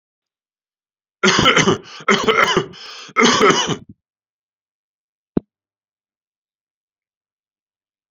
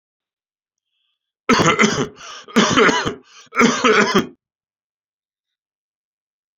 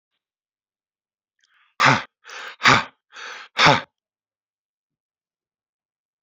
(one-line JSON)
{"three_cough_length": "8.1 s", "three_cough_amplitude": 32767, "three_cough_signal_mean_std_ratio": 0.36, "cough_length": "6.6 s", "cough_amplitude": 28899, "cough_signal_mean_std_ratio": 0.42, "exhalation_length": "6.2 s", "exhalation_amplitude": 32733, "exhalation_signal_mean_std_ratio": 0.26, "survey_phase": "alpha (2021-03-01 to 2021-08-12)", "age": "65+", "gender": "Male", "wearing_mask": "No", "symptom_none": true, "smoker_status": "Ex-smoker", "respiratory_condition_asthma": false, "respiratory_condition_other": false, "recruitment_source": "REACT", "submission_delay": "2 days", "covid_test_result": "Negative", "covid_test_method": "RT-qPCR"}